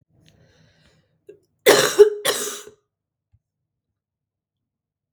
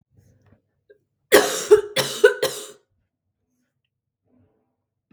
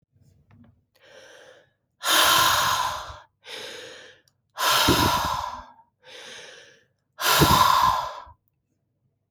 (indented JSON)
{
  "cough_length": "5.1 s",
  "cough_amplitude": 32768,
  "cough_signal_mean_std_ratio": 0.25,
  "three_cough_length": "5.1 s",
  "three_cough_amplitude": 32766,
  "three_cough_signal_mean_std_ratio": 0.27,
  "exhalation_length": "9.3 s",
  "exhalation_amplitude": 20362,
  "exhalation_signal_mean_std_ratio": 0.49,
  "survey_phase": "beta (2021-08-13 to 2022-03-07)",
  "age": "18-44",
  "gender": "Female",
  "wearing_mask": "No",
  "symptom_cough_any": true,
  "symptom_runny_or_blocked_nose": true,
  "symptom_fatigue": true,
  "smoker_status": "Never smoked",
  "respiratory_condition_asthma": false,
  "respiratory_condition_other": false,
  "recruitment_source": "Test and Trace",
  "submission_delay": "2 days",
  "covid_test_result": "Positive",
  "covid_test_method": "RT-qPCR"
}